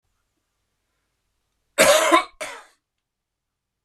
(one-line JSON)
{"cough_length": "3.8 s", "cough_amplitude": 26016, "cough_signal_mean_std_ratio": 0.28, "survey_phase": "beta (2021-08-13 to 2022-03-07)", "age": "45-64", "gender": "Male", "wearing_mask": "No", "symptom_runny_or_blocked_nose": true, "symptom_headache": true, "smoker_status": "Never smoked", "respiratory_condition_asthma": true, "respiratory_condition_other": false, "recruitment_source": "Test and Trace", "submission_delay": "1 day", "covid_test_result": "Positive", "covid_test_method": "LFT"}